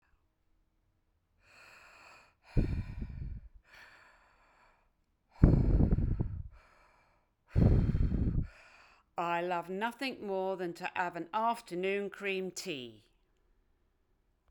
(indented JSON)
{
  "exhalation_length": "14.5 s",
  "exhalation_amplitude": 13204,
  "exhalation_signal_mean_std_ratio": 0.45,
  "survey_phase": "beta (2021-08-13 to 2022-03-07)",
  "age": "65+",
  "gender": "Female",
  "wearing_mask": "No",
  "symptom_none": true,
  "smoker_status": "Never smoked",
  "respiratory_condition_asthma": false,
  "respiratory_condition_other": false,
  "recruitment_source": "REACT",
  "submission_delay": "1 day",
  "covid_test_result": "Negative",
  "covid_test_method": "RT-qPCR"
}